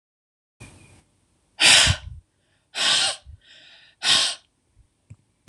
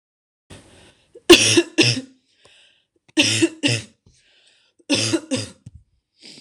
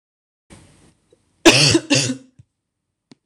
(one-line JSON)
{"exhalation_length": "5.5 s", "exhalation_amplitude": 26025, "exhalation_signal_mean_std_ratio": 0.35, "three_cough_length": "6.4 s", "three_cough_amplitude": 26028, "three_cough_signal_mean_std_ratio": 0.35, "cough_length": "3.3 s", "cough_amplitude": 26028, "cough_signal_mean_std_ratio": 0.32, "survey_phase": "alpha (2021-03-01 to 2021-08-12)", "age": "18-44", "gender": "Female", "wearing_mask": "No", "symptom_cough_any": true, "symptom_fatigue": true, "symptom_headache": true, "symptom_onset": "5 days", "smoker_status": "Never smoked", "respiratory_condition_asthma": false, "respiratory_condition_other": false, "recruitment_source": "Test and Trace", "submission_delay": "1 day", "covid_test_result": "Positive", "covid_test_method": "RT-qPCR", "covid_ct_value": 24.0, "covid_ct_gene": "ORF1ab gene", "covid_ct_mean": 24.9, "covid_viral_load": "6800 copies/ml", "covid_viral_load_category": "Minimal viral load (< 10K copies/ml)"}